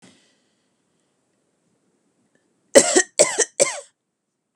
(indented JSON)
{
  "three_cough_length": "4.6 s",
  "three_cough_amplitude": 32768,
  "three_cough_signal_mean_std_ratio": 0.24,
  "survey_phase": "beta (2021-08-13 to 2022-03-07)",
  "age": "45-64",
  "gender": "Female",
  "wearing_mask": "No",
  "symptom_none": true,
  "symptom_onset": "12 days",
  "smoker_status": "Never smoked",
  "respiratory_condition_asthma": false,
  "respiratory_condition_other": false,
  "recruitment_source": "REACT",
  "submission_delay": "1 day",
  "covid_test_result": "Negative",
  "covid_test_method": "RT-qPCR",
  "influenza_a_test_result": "Negative",
  "influenza_b_test_result": "Negative"
}